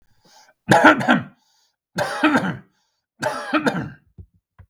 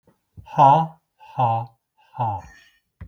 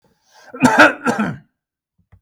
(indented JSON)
{
  "three_cough_length": "4.7 s",
  "three_cough_amplitude": 32768,
  "three_cough_signal_mean_std_ratio": 0.42,
  "exhalation_length": "3.1 s",
  "exhalation_amplitude": 29929,
  "exhalation_signal_mean_std_ratio": 0.38,
  "cough_length": "2.2 s",
  "cough_amplitude": 32768,
  "cough_signal_mean_std_ratio": 0.39,
  "survey_phase": "beta (2021-08-13 to 2022-03-07)",
  "age": "65+",
  "gender": "Male",
  "wearing_mask": "No",
  "symptom_runny_or_blocked_nose": true,
  "smoker_status": "Never smoked",
  "respiratory_condition_asthma": true,
  "respiratory_condition_other": false,
  "recruitment_source": "Test and Trace",
  "submission_delay": "1 day",
  "covid_test_result": "Positive",
  "covid_test_method": "RT-qPCR",
  "covid_ct_value": 19.9,
  "covid_ct_gene": "N gene",
  "covid_ct_mean": 20.1,
  "covid_viral_load": "260000 copies/ml",
  "covid_viral_load_category": "Low viral load (10K-1M copies/ml)"
}